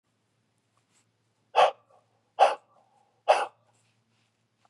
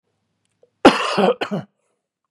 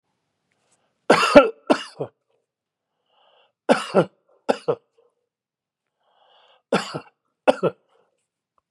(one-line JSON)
{"exhalation_length": "4.7 s", "exhalation_amplitude": 15756, "exhalation_signal_mean_std_ratio": 0.24, "cough_length": "2.3 s", "cough_amplitude": 32768, "cough_signal_mean_std_ratio": 0.34, "three_cough_length": "8.7 s", "three_cough_amplitude": 32768, "three_cough_signal_mean_std_ratio": 0.25, "survey_phase": "beta (2021-08-13 to 2022-03-07)", "age": "65+", "gender": "Male", "wearing_mask": "No", "symptom_none": true, "smoker_status": "Ex-smoker", "respiratory_condition_asthma": false, "respiratory_condition_other": false, "recruitment_source": "Test and Trace", "submission_delay": "2 days", "covid_test_result": "Negative", "covid_test_method": "ePCR"}